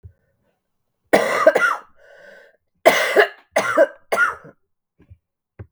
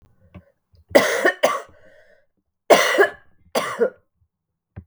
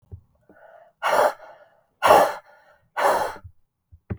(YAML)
cough_length: 5.7 s
cough_amplitude: 32768
cough_signal_mean_std_ratio: 0.4
three_cough_length: 4.9 s
three_cough_amplitude: 32768
three_cough_signal_mean_std_ratio: 0.37
exhalation_length: 4.2 s
exhalation_amplitude: 32448
exhalation_signal_mean_std_ratio: 0.38
survey_phase: beta (2021-08-13 to 2022-03-07)
age: 45-64
gender: Female
wearing_mask: 'No'
symptom_new_continuous_cough: true
symptom_runny_or_blocked_nose: true
symptom_shortness_of_breath: true
symptom_sore_throat: true
symptom_abdominal_pain: true
symptom_change_to_sense_of_smell_or_taste: true
symptom_onset: 6 days
smoker_status: Never smoked
respiratory_condition_asthma: false
respiratory_condition_other: false
recruitment_source: Test and Trace
submission_delay: 2 days
covid_test_result: Negative
covid_test_method: ePCR